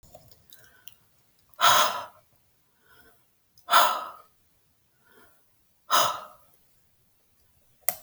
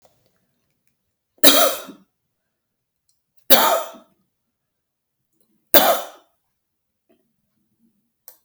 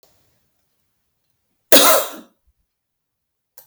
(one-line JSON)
{"exhalation_length": "8.0 s", "exhalation_amplitude": 29444, "exhalation_signal_mean_std_ratio": 0.28, "three_cough_length": "8.4 s", "three_cough_amplitude": 32768, "three_cough_signal_mean_std_ratio": 0.24, "cough_length": "3.7 s", "cough_amplitude": 32768, "cough_signal_mean_std_ratio": 0.24, "survey_phase": "beta (2021-08-13 to 2022-03-07)", "age": "65+", "gender": "Female", "wearing_mask": "No", "symptom_none": true, "smoker_status": "Never smoked", "respiratory_condition_asthma": false, "respiratory_condition_other": false, "recruitment_source": "REACT", "submission_delay": "3 days", "covid_test_result": "Negative", "covid_test_method": "RT-qPCR"}